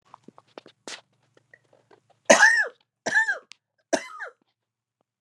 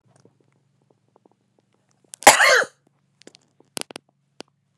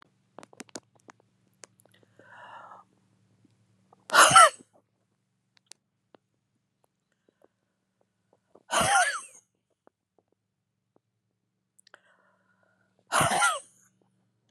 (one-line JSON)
{"three_cough_length": "5.2 s", "three_cough_amplitude": 29978, "three_cough_signal_mean_std_ratio": 0.29, "cough_length": "4.8 s", "cough_amplitude": 32768, "cough_signal_mean_std_ratio": 0.21, "exhalation_length": "14.5 s", "exhalation_amplitude": 22772, "exhalation_signal_mean_std_ratio": 0.22, "survey_phase": "beta (2021-08-13 to 2022-03-07)", "age": "65+", "gender": "Female", "wearing_mask": "No", "symptom_cough_any": true, "symptom_shortness_of_breath": true, "symptom_onset": "12 days", "smoker_status": "Never smoked", "respiratory_condition_asthma": false, "respiratory_condition_other": false, "recruitment_source": "REACT", "submission_delay": "6 days", "covid_test_result": "Negative", "covid_test_method": "RT-qPCR"}